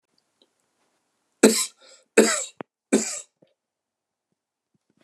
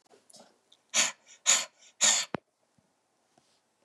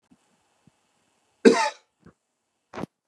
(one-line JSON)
{"three_cough_length": "5.0 s", "three_cough_amplitude": 30711, "three_cough_signal_mean_std_ratio": 0.25, "exhalation_length": "3.8 s", "exhalation_amplitude": 11600, "exhalation_signal_mean_std_ratio": 0.31, "cough_length": "3.1 s", "cough_amplitude": 30216, "cough_signal_mean_std_ratio": 0.2, "survey_phase": "beta (2021-08-13 to 2022-03-07)", "age": "45-64", "gender": "Male", "wearing_mask": "No", "symptom_cough_any": true, "smoker_status": "Current smoker (1 to 10 cigarettes per day)", "respiratory_condition_asthma": true, "respiratory_condition_other": false, "recruitment_source": "REACT", "submission_delay": "2 days", "covid_test_result": "Negative", "covid_test_method": "RT-qPCR", "influenza_a_test_result": "Negative", "influenza_b_test_result": "Negative"}